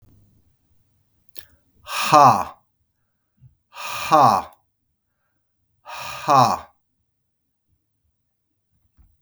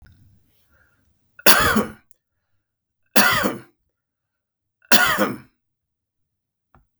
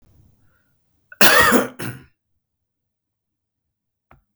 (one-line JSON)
{"exhalation_length": "9.2 s", "exhalation_amplitude": 32766, "exhalation_signal_mean_std_ratio": 0.28, "three_cough_length": "7.0 s", "three_cough_amplitude": 32768, "three_cough_signal_mean_std_ratio": 0.31, "cough_length": "4.4 s", "cough_amplitude": 32768, "cough_signal_mean_std_ratio": 0.27, "survey_phase": "beta (2021-08-13 to 2022-03-07)", "age": "45-64", "gender": "Male", "wearing_mask": "No", "symptom_cough_any": true, "symptom_runny_or_blocked_nose": true, "smoker_status": "Current smoker (1 to 10 cigarettes per day)", "respiratory_condition_asthma": false, "respiratory_condition_other": false, "recruitment_source": "Test and Trace", "submission_delay": "1 day", "covid_test_result": "Positive", "covid_test_method": "RT-qPCR", "covid_ct_value": 26.4, "covid_ct_gene": "N gene"}